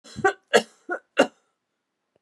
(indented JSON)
{
  "three_cough_length": "2.2 s",
  "three_cough_amplitude": 22698,
  "three_cough_signal_mean_std_ratio": 0.28,
  "survey_phase": "beta (2021-08-13 to 2022-03-07)",
  "age": "45-64",
  "gender": "Female",
  "wearing_mask": "No",
  "symptom_cough_any": true,
  "symptom_runny_or_blocked_nose": true,
  "symptom_fatigue": true,
  "smoker_status": "Never smoked",
  "respiratory_condition_asthma": false,
  "respiratory_condition_other": false,
  "recruitment_source": "Test and Trace",
  "submission_delay": "2 days",
  "covid_test_result": "Positive",
  "covid_test_method": "LFT"
}